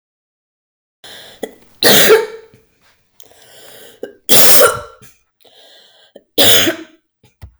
{"three_cough_length": "7.6 s", "three_cough_amplitude": 32768, "three_cough_signal_mean_std_ratio": 0.36, "survey_phase": "beta (2021-08-13 to 2022-03-07)", "age": "18-44", "gender": "Female", "wearing_mask": "No", "symptom_fatigue": true, "smoker_status": "Ex-smoker", "respiratory_condition_asthma": false, "respiratory_condition_other": false, "recruitment_source": "REACT", "submission_delay": "0 days", "covid_test_result": "Negative", "covid_test_method": "RT-qPCR"}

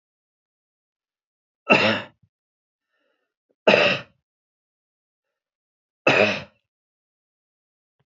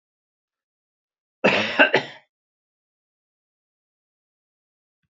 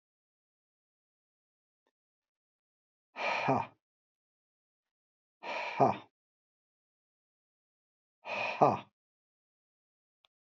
{"three_cough_length": "8.2 s", "three_cough_amplitude": 27143, "three_cough_signal_mean_std_ratio": 0.25, "cough_length": "5.1 s", "cough_amplitude": 28467, "cough_signal_mean_std_ratio": 0.23, "exhalation_length": "10.4 s", "exhalation_amplitude": 9530, "exhalation_signal_mean_std_ratio": 0.25, "survey_phase": "beta (2021-08-13 to 2022-03-07)", "age": "65+", "gender": "Male", "wearing_mask": "No", "symptom_none": true, "smoker_status": "Never smoked", "respiratory_condition_asthma": false, "respiratory_condition_other": false, "recruitment_source": "REACT", "submission_delay": "4 days", "covid_test_result": "Negative", "covid_test_method": "RT-qPCR", "influenza_a_test_result": "Negative", "influenza_b_test_result": "Negative"}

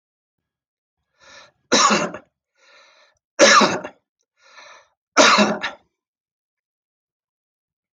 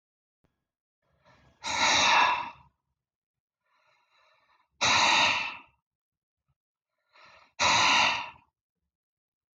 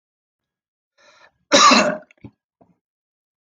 {"three_cough_length": "7.9 s", "three_cough_amplitude": 26087, "three_cough_signal_mean_std_ratio": 0.31, "exhalation_length": "9.6 s", "exhalation_amplitude": 10339, "exhalation_signal_mean_std_ratio": 0.39, "cough_length": "3.4 s", "cough_amplitude": 26017, "cough_signal_mean_std_ratio": 0.29, "survey_phase": "beta (2021-08-13 to 2022-03-07)", "age": "45-64", "gender": "Male", "wearing_mask": "No", "symptom_none": true, "smoker_status": "Never smoked", "respiratory_condition_asthma": false, "respiratory_condition_other": false, "recruitment_source": "REACT", "submission_delay": "2 days", "covid_test_result": "Negative", "covid_test_method": "RT-qPCR"}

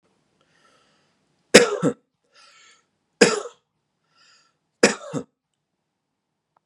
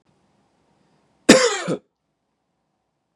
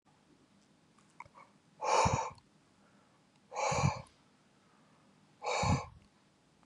{"three_cough_length": "6.7 s", "three_cough_amplitude": 32768, "three_cough_signal_mean_std_ratio": 0.21, "cough_length": "3.2 s", "cough_amplitude": 32768, "cough_signal_mean_std_ratio": 0.24, "exhalation_length": "6.7 s", "exhalation_amplitude": 5119, "exhalation_signal_mean_std_ratio": 0.38, "survey_phase": "beta (2021-08-13 to 2022-03-07)", "age": "18-44", "gender": "Male", "wearing_mask": "No", "symptom_none": true, "smoker_status": "Never smoked", "respiratory_condition_asthma": false, "respiratory_condition_other": false, "recruitment_source": "REACT", "submission_delay": "1 day", "covid_test_result": "Negative", "covid_test_method": "RT-qPCR"}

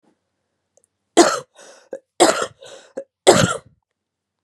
{"three_cough_length": "4.4 s", "three_cough_amplitude": 32768, "three_cough_signal_mean_std_ratio": 0.3, "survey_phase": "beta (2021-08-13 to 2022-03-07)", "age": "18-44", "gender": "Female", "wearing_mask": "No", "symptom_cough_any": true, "symptom_runny_or_blocked_nose": true, "symptom_shortness_of_breath": true, "symptom_sore_throat": true, "symptom_abdominal_pain": true, "symptom_fatigue": true, "symptom_fever_high_temperature": true, "symptom_headache": true, "symptom_other": true, "symptom_onset": "3 days", "smoker_status": "Current smoker (1 to 10 cigarettes per day)", "respiratory_condition_asthma": false, "respiratory_condition_other": false, "recruitment_source": "Test and Trace", "submission_delay": "1 day", "covid_test_result": "Positive", "covid_test_method": "RT-qPCR", "covid_ct_value": 19.7, "covid_ct_gene": "ORF1ab gene", "covid_ct_mean": 20.2, "covid_viral_load": "230000 copies/ml", "covid_viral_load_category": "Low viral load (10K-1M copies/ml)"}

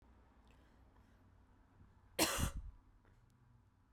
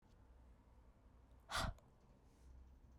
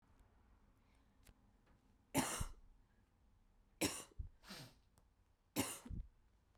{"cough_length": "3.9 s", "cough_amplitude": 3309, "cough_signal_mean_std_ratio": 0.32, "exhalation_length": "3.0 s", "exhalation_amplitude": 1150, "exhalation_signal_mean_std_ratio": 0.41, "three_cough_length": "6.6 s", "three_cough_amplitude": 2029, "three_cough_signal_mean_std_ratio": 0.35, "survey_phase": "beta (2021-08-13 to 2022-03-07)", "age": "18-44", "gender": "Female", "wearing_mask": "No", "symptom_cough_any": true, "symptom_new_continuous_cough": true, "symptom_runny_or_blocked_nose": true, "symptom_sore_throat": true, "symptom_fatigue": true, "symptom_fever_high_temperature": true, "symptom_headache": true, "symptom_change_to_sense_of_smell_or_taste": true, "symptom_loss_of_taste": true, "symptom_onset": "3 days", "smoker_status": "Never smoked", "respiratory_condition_asthma": false, "respiratory_condition_other": false, "recruitment_source": "Test and Trace", "submission_delay": "1 day", "covid_test_result": "Positive", "covid_test_method": "RT-qPCR", "covid_ct_value": 19.9, "covid_ct_gene": "ORF1ab gene", "covid_ct_mean": 20.4, "covid_viral_load": "200000 copies/ml", "covid_viral_load_category": "Low viral load (10K-1M copies/ml)"}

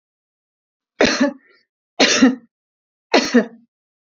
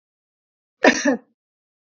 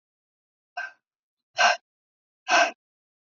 {"three_cough_length": "4.2 s", "three_cough_amplitude": 29062, "three_cough_signal_mean_std_ratio": 0.36, "cough_length": "1.9 s", "cough_amplitude": 27464, "cough_signal_mean_std_ratio": 0.28, "exhalation_length": "3.3 s", "exhalation_amplitude": 14725, "exhalation_signal_mean_std_ratio": 0.28, "survey_phase": "beta (2021-08-13 to 2022-03-07)", "age": "45-64", "gender": "Female", "wearing_mask": "No", "symptom_none": true, "smoker_status": "Never smoked", "respiratory_condition_asthma": false, "respiratory_condition_other": false, "recruitment_source": "REACT", "submission_delay": "1 day", "covid_test_result": "Negative", "covid_test_method": "RT-qPCR", "influenza_a_test_result": "Negative", "influenza_b_test_result": "Negative"}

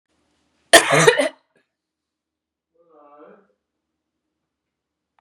{"cough_length": "5.2 s", "cough_amplitude": 32768, "cough_signal_mean_std_ratio": 0.22, "survey_phase": "beta (2021-08-13 to 2022-03-07)", "age": "45-64", "gender": "Female", "wearing_mask": "Yes", "symptom_sore_throat": true, "symptom_fatigue": true, "symptom_onset": "3 days", "smoker_status": "Never smoked", "respiratory_condition_asthma": false, "respiratory_condition_other": false, "recruitment_source": "Test and Trace", "submission_delay": "1 day", "covid_test_result": "Positive", "covid_test_method": "RT-qPCR", "covid_ct_value": 22.7, "covid_ct_gene": "N gene"}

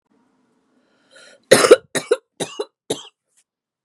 {"three_cough_length": "3.8 s", "three_cough_amplitude": 32768, "three_cough_signal_mean_std_ratio": 0.24, "survey_phase": "beta (2021-08-13 to 2022-03-07)", "age": "45-64", "gender": "Female", "wearing_mask": "No", "symptom_cough_any": true, "symptom_runny_or_blocked_nose": true, "symptom_sore_throat": true, "symptom_fatigue": true, "symptom_headache": true, "symptom_onset": "5 days", "smoker_status": "Current smoker (1 to 10 cigarettes per day)", "respiratory_condition_asthma": false, "respiratory_condition_other": false, "recruitment_source": "Test and Trace", "submission_delay": "2 days", "covid_test_result": "Positive", "covid_test_method": "RT-qPCR", "covid_ct_value": 27.2, "covid_ct_gene": "N gene"}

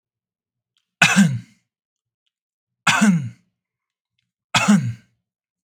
{"three_cough_length": "5.6 s", "three_cough_amplitude": 32768, "three_cough_signal_mean_std_ratio": 0.35, "survey_phase": "beta (2021-08-13 to 2022-03-07)", "age": "18-44", "gender": "Male", "wearing_mask": "No", "symptom_none": true, "symptom_onset": "12 days", "smoker_status": "Current smoker (1 to 10 cigarettes per day)", "respiratory_condition_asthma": false, "respiratory_condition_other": false, "recruitment_source": "REACT", "submission_delay": "1 day", "covid_test_result": "Negative", "covid_test_method": "RT-qPCR"}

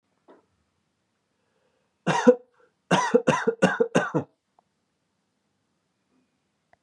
{"cough_length": "6.8 s", "cough_amplitude": 23345, "cough_signal_mean_std_ratio": 0.3, "survey_phase": "beta (2021-08-13 to 2022-03-07)", "age": "18-44", "gender": "Male", "wearing_mask": "No", "symptom_runny_or_blocked_nose": true, "symptom_fatigue": true, "symptom_headache": true, "symptom_change_to_sense_of_smell_or_taste": true, "symptom_loss_of_taste": true, "symptom_other": true, "symptom_onset": "4 days", "smoker_status": "Never smoked", "respiratory_condition_asthma": false, "respiratory_condition_other": false, "recruitment_source": "Test and Trace", "submission_delay": "1 day", "covid_test_result": "Positive", "covid_test_method": "RT-qPCR", "covid_ct_value": 27.4, "covid_ct_gene": "N gene"}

